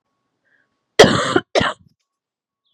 {"cough_length": "2.7 s", "cough_amplitude": 32768, "cough_signal_mean_std_ratio": 0.3, "survey_phase": "beta (2021-08-13 to 2022-03-07)", "age": "18-44", "gender": "Female", "wearing_mask": "No", "symptom_cough_any": true, "symptom_fatigue": true, "symptom_onset": "4 days", "smoker_status": "Never smoked", "respiratory_condition_asthma": false, "respiratory_condition_other": false, "recruitment_source": "Test and Trace", "submission_delay": "2 days", "covid_test_result": "Positive", "covid_test_method": "RT-qPCR", "covid_ct_value": 18.5, "covid_ct_gene": "ORF1ab gene", "covid_ct_mean": 19.1, "covid_viral_load": "540000 copies/ml", "covid_viral_load_category": "Low viral load (10K-1M copies/ml)"}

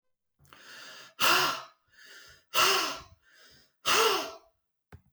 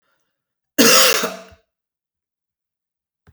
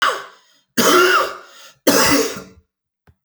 {"exhalation_length": "5.1 s", "exhalation_amplitude": 10706, "exhalation_signal_mean_std_ratio": 0.42, "cough_length": "3.3 s", "cough_amplitude": 32768, "cough_signal_mean_std_ratio": 0.31, "three_cough_length": "3.2 s", "three_cough_amplitude": 32768, "three_cough_signal_mean_std_ratio": 0.53, "survey_phase": "beta (2021-08-13 to 2022-03-07)", "age": "45-64", "gender": "Male", "wearing_mask": "No", "symptom_none": true, "smoker_status": "Ex-smoker", "respiratory_condition_asthma": true, "respiratory_condition_other": false, "recruitment_source": "REACT", "submission_delay": "2 days", "covid_test_result": "Negative", "covid_test_method": "RT-qPCR"}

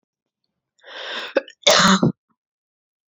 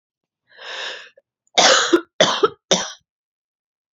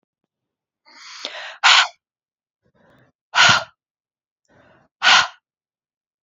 {"cough_length": "3.1 s", "cough_amplitude": 29566, "cough_signal_mean_std_ratio": 0.35, "three_cough_length": "3.9 s", "three_cough_amplitude": 32767, "three_cough_signal_mean_std_ratio": 0.37, "exhalation_length": "6.2 s", "exhalation_amplitude": 31132, "exhalation_signal_mean_std_ratio": 0.29, "survey_phase": "beta (2021-08-13 to 2022-03-07)", "age": "18-44", "gender": "Female", "wearing_mask": "No", "symptom_cough_any": true, "symptom_new_continuous_cough": true, "symptom_runny_or_blocked_nose": true, "symptom_shortness_of_breath": true, "symptom_sore_throat": true, "symptom_diarrhoea": true, "symptom_fatigue": true, "symptom_headache": true, "symptom_onset": "3 days", "smoker_status": "Never smoked", "respiratory_condition_asthma": false, "respiratory_condition_other": false, "recruitment_source": "Test and Trace", "submission_delay": "1 day", "covid_test_result": "Positive", "covid_test_method": "RT-qPCR", "covid_ct_value": 35.9, "covid_ct_gene": "ORF1ab gene"}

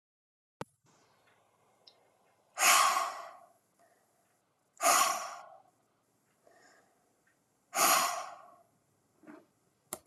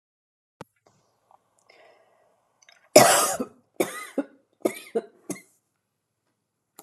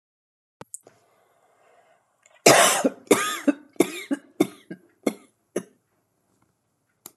{"exhalation_length": "10.1 s", "exhalation_amplitude": 8722, "exhalation_signal_mean_std_ratio": 0.32, "three_cough_length": "6.8 s", "three_cough_amplitude": 32767, "three_cough_signal_mean_std_ratio": 0.23, "cough_length": "7.2 s", "cough_amplitude": 31166, "cough_signal_mean_std_ratio": 0.28, "survey_phase": "alpha (2021-03-01 to 2021-08-12)", "age": "18-44", "gender": "Female", "wearing_mask": "No", "symptom_none": true, "smoker_status": "Ex-smoker", "respiratory_condition_asthma": false, "respiratory_condition_other": false, "recruitment_source": "REACT", "submission_delay": "2 days", "covid_test_result": "Negative", "covid_test_method": "RT-qPCR"}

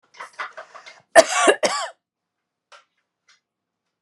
{"cough_length": "4.0 s", "cough_amplitude": 32768, "cough_signal_mean_std_ratio": 0.27, "survey_phase": "beta (2021-08-13 to 2022-03-07)", "age": "45-64", "gender": "Female", "wearing_mask": "No", "symptom_none": true, "smoker_status": "Ex-smoker", "respiratory_condition_asthma": false, "respiratory_condition_other": false, "recruitment_source": "REACT", "submission_delay": "2 days", "covid_test_result": "Negative", "covid_test_method": "RT-qPCR", "influenza_a_test_result": "Negative", "influenza_b_test_result": "Negative"}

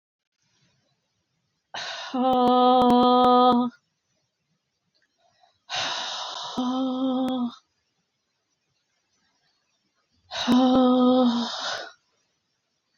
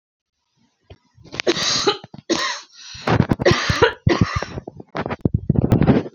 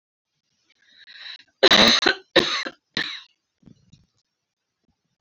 {"exhalation_length": "13.0 s", "exhalation_amplitude": 14615, "exhalation_signal_mean_std_ratio": 0.5, "three_cough_length": "6.1 s", "three_cough_amplitude": 32768, "three_cough_signal_mean_std_ratio": 0.5, "cough_length": "5.2 s", "cough_amplitude": 30110, "cough_signal_mean_std_ratio": 0.3, "survey_phase": "beta (2021-08-13 to 2022-03-07)", "age": "45-64", "gender": "Female", "wearing_mask": "No", "symptom_cough_any": true, "symptom_runny_or_blocked_nose": true, "symptom_shortness_of_breath": true, "symptom_sore_throat": true, "symptom_fatigue": true, "symptom_headache": true, "symptom_change_to_sense_of_smell_or_taste": true, "symptom_onset": "4 days", "smoker_status": "Ex-smoker", "respiratory_condition_asthma": false, "respiratory_condition_other": false, "recruitment_source": "Test and Trace", "submission_delay": "2 days", "covid_test_result": "Positive", "covid_test_method": "RT-qPCR", "covid_ct_value": 13.3, "covid_ct_gene": "ORF1ab gene"}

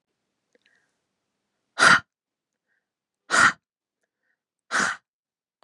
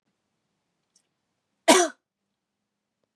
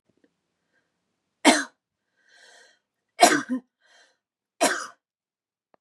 {"exhalation_length": "5.6 s", "exhalation_amplitude": 23861, "exhalation_signal_mean_std_ratio": 0.25, "cough_length": "3.2 s", "cough_amplitude": 24566, "cough_signal_mean_std_ratio": 0.19, "three_cough_length": "5.8 s", "three_cough_amplitude": 27391, "three_cough_signal_mean_std_ratio": 0.24, "survey_phase": "beta (2021-08-13 to 2022-03-07)", "age": "18-44", "gender": "Female", "wearing_mask": "No", "symptom_cough_any": true, "symptom_runny_or_blocked_nose": true, "symptom_onset": "11 days", "smoker_status": "Never smoked", "respiratory_condition_asthma": false, "respiratory_condition_other": false, "recruitment_source": "REACT", "submission_delay": "1 day", "covid_test_result": "Negative", "covid_test_method": "RT-qPCR", "influenza_a_test_result": "Negative", "influenza_b_test_result": "Negative"}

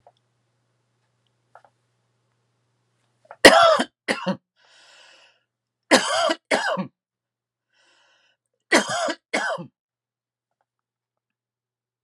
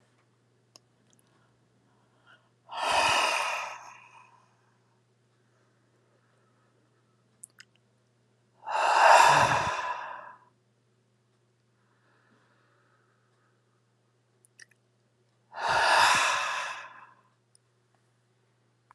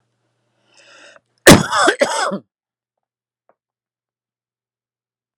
{"three_cough_length": "12.0 s", "three_cough_amplitude": 32768, "three_cough_signal_mean_std_ratio": 0.26, "exhalation_length": "18.9 s", "exhalation_amplitude": 18855, "exhalation_signal_mean_std_ratio": 0.32, "cough_length": "5.4 s", "cough_amplitude": 32768, "cough_signal_mean_std_ratio": 0.25, "survey_phase": "beta (2021-08-13 to 2022-03-07)", "age": "45-64", "gender": "Male", "wearing_mask": "No", "symptom_none": true, "smoker_status": "Never smoked", "respiratory_condition_asthma": false, "respiratory_condition_other": false, "recruitment_source": "REACT", "submission_delay": "2 days", "covid_test_result": "Negative", "covid_test_method": "RT-qPCR", "influenza_a_test_result": "Unknown/Void", "influenza_b_test_result": "Unknown/Void"}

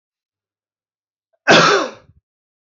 {"cough_length": "2.7 s", "cough_amplitude": 30117, "cough_signal_mean_std_ratio": 0.31, "survey_phase": "beta (2021-08-13 to 2022-03-07)", "age": "45-64", "gender": "Male", "wearing_mask": "No", "symptom_cough_any": true, "symptom_new_continuous_cough": true, "symptom_runny_or_blocked_nose": true, "symptom_sore_throat": true, "symptom_fatigue": true, "symptom_headache": true, "symptom_onset": "4 days", "smoker_status": "Ex-smoker", "respiratory_condition_asthma": false, "respiratory_condition_other": false, "recruitment_source": "Test and Trace", "submission_delay": "2 days", "covid_test_result": "Positive", "covid_test_method": "RT-qPCR", "covid_ct_value": 25.1, "covid_ct_gene": "N gene"}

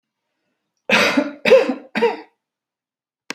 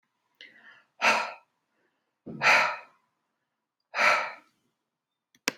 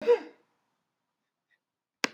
{"three_cough_length": "3.3 s", "three_cough_amplitude": 29303, "three_cough_signal_mean_std_ratio": 0.4, "exhalation_length": "5.6 s", "exhalation_amplitude": 16780, "exhalation_signal_mean_std_ratio": 0.33, "cough_length": "2.1 s", "cough_amplitude": 15206, "cough_signal_mean_std_ratio": 0.22, "survey_phase": "alpha (2021-03-01 to 2021-08-12)", "age": "45-64", "gender": "Female", "wearing_mask": "No", "symptom_none": true, "smoker_status": "Ex-smoker", "respiratory_condition_asthma": false, "respiratory_condition_other": false, "recruitment_source": "REACT", "submission_delay": "2 days", "covid_test_result": "Negative", "covid_test_method": "RT-qPCR"}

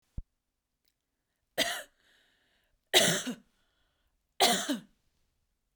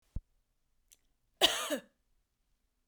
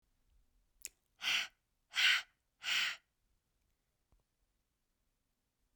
{"three_cough_length": "5.8 s", "three_cough_amplitude": 13090, "three_cough_signal_mean_std_ratio": 0.3, "cough_length": "2.9 s", "cough_amplitude": 10842, "cough_signal_mean_std_ratio": 0.24, "exhalation_length": "5.8 s", "exhalation_amplitude": 4070, "exhalation_signal_mean_std_ratio": 0.29, "survey_phase": "beta (2021-08-13 to 2022-03-07)", "age": "18-44", "gender": "Female", "wearing_mask": "No", "symptom_fatigue": true, "symptom_onset": "2 days", "smoker_status": "Ex-smoker", "respiratory_condition_asthma": false, "respiratory_condition_other": false, "recruitment_source": "REACT", "submission_delay": "1 day", "covid_test_result": "Negative", "covid_test_method": "RT-qPCR"}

